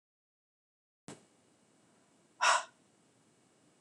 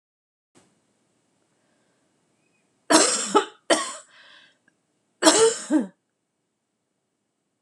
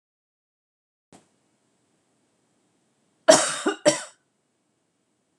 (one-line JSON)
{"exhalation_length": "3.8 s", "exhalation_amplitude": 5525, "exhalation_signal_mean_std_ratio": 0.21, "three_cough_length": "7.6 s", "three_cough_amplitude": 26028, "three_cough_signal_mean_std_ratio": 0.3, "cough_length": "5.4 s", "cough_amplitude": 26028, "cough_signal_mean_std_ratio": 0.2, "survey_phase": "alpha (2021-03-01 to 2021-08-12)", "age": "18-44", "gender": "Female", "wearing_mask": "No", "symptom_cough_any": true, "symptom_fatigue": true, "symptom_onset": "12 days", "smoker_status": "Never smoked", "respiratory_condition_asthma": false, "respiratory_condition_other": false, "recruitment_source": "REACT", "submission_delay": "1 day", "covid_test_result": "Negative", "covid_test_method": "RT-qPCR"}